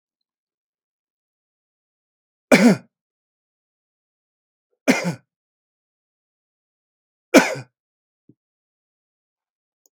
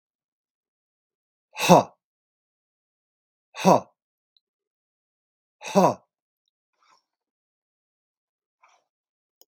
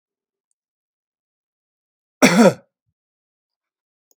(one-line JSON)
{"three_cough_length": "9.9 s", "three_cough_amplitude": 32767, "three_cough_signal_mean_std_ratio": 0.18, "exhalation_length": "9.5 s", "exhalation_amplitude": 32768, "exhalation_signal_mean_std_ratio": 0.18, "cough_length": "4.2 s", "cough_amplitude": 32768, "cough_signal_mean_std_ratio": 0.21, "survey_phase": "beta (2021-08-13 to 2022-03-07)", "age": "65+", "gender": "Male", "wearing_mask": "No", "symptom_none": true, "smoker_status": "Never smoked", "respiratory_condition_asthma": false, "respiratory_condition_other": false, "recruitment_source": "REACT", "submission_delay": "1 day", "covid_test_result": "Negative", "covid_test_method": "RT-qPCR"}